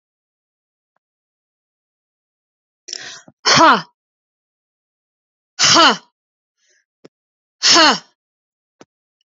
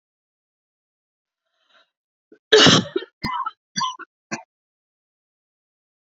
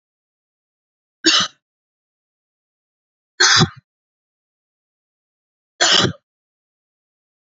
{"exhalation_length": "9.4 s", "exhalation_amplitude": 32481, "exhalation_signal_mean_std_ratio": 0.27, "cough_length": "6.1 s", "cough_amplitude": 32767, "cough_signal_mean_std_ratio": 0.25, "three_cough_length": "7.6 s", "three_cough_amplitude": 31108, "three_cough_signal_mean_std_ratio": 0.25, "survey_phase": "beta (2021-08-13 to 2022-03-07)", "age": "45-64", "gender": "Female", "wearing_mask": "No", "symptom_cough_any": true, "symptom_runny_or_blocked_nose": true, "symptom_sore_throat": true, "symptom_fatigue": true, "symptom_headache": true, "symptom_onset": "3 days", "smoker_status": "Never smoked", "respiratory_condition_asthma": false, "respiratory_condition_other": false, "recruitment_source": "Test and Trace", "submission_delay": "2 days", "covid_test_result": "Positive", "covid_test_method": "ePCR"}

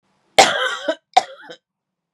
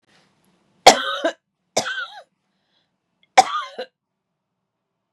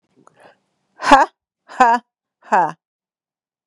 {"cough_length": "2.1 s", "cough_amplitude": 32768, "cough_signal_mean_std_ratio": 0.33, "three_cough_length": "5.1 s", "three_cough_amplitude": 32768, "three_cough_signal_mean_std_ratio": 0.23, "exhalation_length": "3.7 s", "exhalation_amplitude": 32768, "exhalation_signal_mean_std_ratio": 0.31, "survey_phase": "beta (2021-08-13 to 2022-03-07)", "age": "45-64", "gender": "Female", "wearing_mask": "No", "symptom_none": true, "smoker_status": "Ex-smoker", "respiratory_condition_asthma": false, "respiratory_condition_other": false, "recruitment_source": "REACT", "submission_delay": "2 days", "covid_test_result": "Negative", "covid_test_method": "RT-qPCR", "influenza_a_test_result": "Negative", "influenza_b_test_result": "Negative"}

